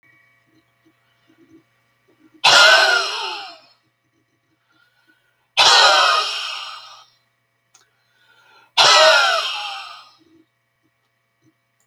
exhalation_length: 11.9 s
exhalation_amplitude: 32768
exhalation_signal_mean_std_ratio: 0.38
survey_phase: beta (2021-08-13 to 2022-03-07)
age: 65+
gender: Male
wearing_mask: 'No'
symptom_none: true
smoker_status: Ex-smoker
respiratory_condition_asthma: false
respiratory_condition_other: false
recruitment_source: REACT
submission_delay: 2 days
covid_test_result: Negative
covid_test_method: RT-qPCR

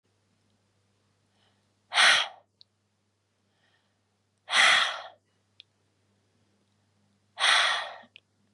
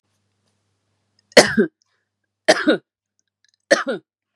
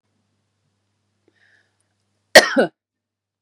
exhalation_length: 8.5 s
exhalation_amplitude: 14070
exhalation_signal_mean_std_ratio: 0.3
three_cough_length: 4.4 s
three_cough_amplitude: 32768
three_cough_signal_mean_std_ratio: 0.27
cough_length: 3.4 s
cough_amplitude: 32768
cough_signal_mean_std_ratio: 0.18
survey_phase: beta (2021-08-13 to 2022-03-07)
age: 18-44
gender: Female
wearing_mask: 'No'
symptom_none: true
smoker_status: Never smoked
respiratory_condition_asthma: false
respiratory_condition_other: false
recruitment_source: REACT
submission_delay: 1 day
covid_test_result: Negative
covid_test_method: RT-qPCR
influenza_a_test_result: Negative
influenza_b_test_result: Negative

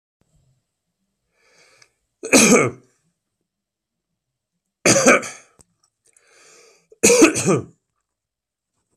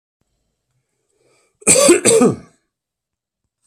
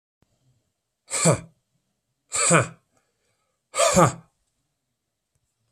three_cough_length: 9.0 s
three_cough_amplitude: 32767
three_cough_signal_mean_std_ratio: 0.3
cough_length: 3.7 s
cough_amplitude: 32768
cough_signal_mean_std_ratio: 0.35
exhalation_length: 5.7 s
exhalation_amplitude: 24124
exhalation_signal_mean_std_ratio: 0.31
survey_phase: beta (2021-08-13 to 2022-03-07)
age: 45-64
gender: Male
wearing_mask: 'No'
symptom_runny_or_blocked_nose: true
symptom_sore_throat: true
symptom_diarrhoea: true
symptom_fatigue: true
symptom_other: true
symptom_onset: 4 days
smoker_status: Ex-smoker
respiratory_condition_asthma: false
respiratory_condition_other: false
recruitment_source: Test and Trace
submission_delay: 1 day
covid_test_result: Positive
covid_test_method: RT-qPCR
covid_ct_value: 19.1
covid_ct_gene: ORF1ab gene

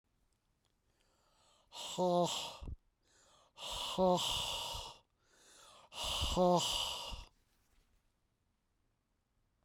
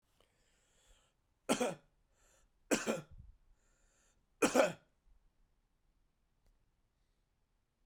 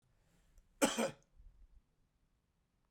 exhalation_length: 9.6 s
exhalation_amplitude: 3604
exhalation_signal_mean_std_ratio: 0.45
three_cough_length: 7.9 s
three_cough_amplitude: 5669
three_cough_signal_mean_std_ratio: 0.24
cough_length: 2.9 s
cough_amplitude: 4843
cough_signal_mean_std_ratio: 0.25
survey_phase: beta (2021-08-13 to 2022-03-07)
age: 45-64
gender: Male
wearing_mask: 'No'
symptom_cough_any: true
symptom_runny_or_blocked_nose: true
symptom_sore_throat: true
symptom_fatigue: true
symptom_headache: true
symptom_onset: 4 days
smoker_status: Never smoked
respiratory_condition_asthma: false
respiratory_condition_other: false
recruitment_source: Test and Trace
submission_delay: 2 days
covid_test_result: Positive
covid_test_method: RT-qPCR
covid_ct_value: 17.7
covid_ct_gene: N gene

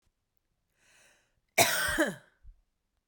cough_length: 3.1 s
cough_amplitude: 12200
cough_signal_mean_std_ratio: 0.32
survey_phase: beta (2021-08-13 to 2022-03-07)
age: 18-44
gender: Female
wearing_mask: 'No'
symptom_none: true
smoker_status: Ex-smoker
respiratory_condition_asthma: false
respiratory_condition_other: false
recruitment_source: REACT
submission_delay: 1 day
covid_test_result: Negative
covid_test_method: RT-qPCR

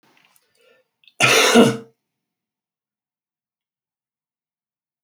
cough_length: 5.0 s
cough_amplitude: 28588
cough_signal_mean_std_ratio: 0.26
survey_phase: alpha (2021-03-01 to 2021-08-12)
age: 65+
gender: Male
wearing_mask: 'No'
symptom_none: true
smoker_status: Ex-smoker
respiratory_condition_asthma: false
respiratory_condition_other: false
recruitment_source: REACT
submission_delay: 2 days
covid_test_result: Negative
covid_test_method: RT-qPCR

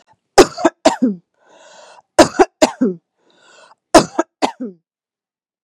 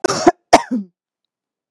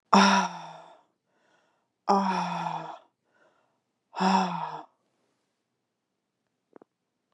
three_cough_length: 5.6 s
three_cough_amplitude: 32768
three_cough_signal_mean_std_ratio: 0.3
cough_length: 1.7 s
cough_amplitude: 32768
cough_signal_mean_std_ratio: 0.32
exhalation_length: 7.3 s
exhalation_amplitude: 20957
exhalation_signal_mean_std_ratio: 0.35
survey_phase: beta (2021-08-13 to 2022-03-07)
age: 45-64
gender: Female
wearing_mask: 'No'
symptom_runny_or_blocked_nose: true
symptom_sore_throat: true
symptom_fatigue: true
symptom_fever_high_temperature: true
symptom_headache: true
smoker_status: Ex-smoker
respiratory_condition_asthma: false
respiratory_condition_other: false
recruitment_source: Test and Trace
submission_delay: 1 day
covid_test_result: Positive
covid_test_method: LFT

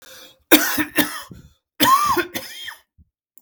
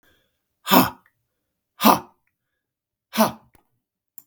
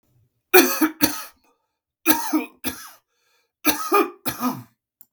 cough_length: 3.4 s
cough_amplitude: 32768
cough_signal_mean_std_ratio: 0.45
exhalation_length: 4.3 s
exhalation_amplitude: 32768
exhalation_signal_mean_std_ratio: 0.26
three_cough_length: 5.1 s
three_cough_amplitude: 32768
three_cough_signal_mean_std_ratio: 0.39
survey_phase: beta (2021-08-13 to 2022-03-07)
age: 45-64
gender: Male
wearing_mask: 'No'
symptom_none: true
smoker_status: Never smoked
respiratory_condition_asthma: true
respiratory_condition_other: false
recruitment_source: REACT
submission_delay: 12 days
covid_test_result: Negative
covid_test_method: RT-qPCR
influenza_a_test_result: Unknown/Void
influenza_b_test_result: Unknown/Void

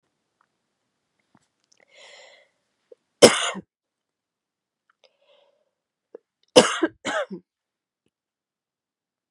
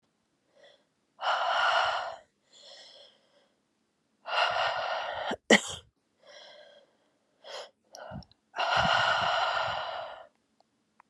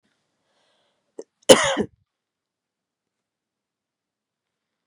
three_cough_length: 9.3 s
three_cough_amplitude: 32768
three_cough_signal_mean_std_ratio: 0.17
exhalation_length: 11.1 s
exhalation_amplitude: 17367
exhalation_signal_mean_std_ratio: 0.47
cough_length: 4.9 s
cough_amplitude: 32768
cough_signal_mean_std_ratio: 0.16
survey_phase: beta (2021-08-13 to 2022-03-07)
age: 18-44
gender: Female
wearing_mask: 'No'
symptom_cough_any: true
symptom_runny_or_blocked_nose: true
symptom_shortness_of_breath: true
symptom_sore_throat: true
symptom_abdominal_pain: true
symptom_fatigue: true
symptom_fever_high_temperature: true
symptom_headache: true
symptom_change_to_sense_of_smell_or_taste: true
symptom_loss_of_taste: true
symptom_onset: 2 days
smoker_status: Ex-smoker
respiratory_condition_asthma: false
respiratory_condition_other: false
recruitment_source: Test and Trace
submission_delay: 2 days
covid_test_result: Positive
covid_test_method: RT-qPCR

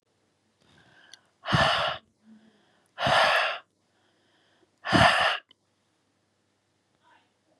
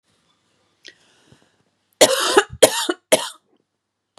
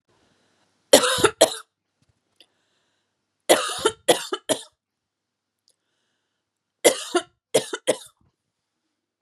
exhalation_length: 7.6 s
exhalation_amplitude: 19056
exhalation_signal_mean_std_ratio: 0.36
cough_length: 4.2 s
cough_amplitude: 32768
cough_signal_mean_std_ratio: 0.29
three_cough_length: 9.2 s
three_cough_amplitude: 32767
three_cough_signal_mean_std_ratio: 0.27
survey_phase: beta (2021-08-13 to 2022-03-07)
age: 18-44
gender: Female
wearing_mask: 'No'
symptom_sore_throat: true
symptom_onset: 2 days
smoker_status: Never smoked
respiratory_condition_asthma: false
respiratory_condition_other: false
recruitment_source: REACT
submission_delay: 2 days
covid_test_result: Negative
covid_test_method: RT-qPCR
influenza_a_test_result: Unknown/Void
influenza_b_test_result: Unknown/Void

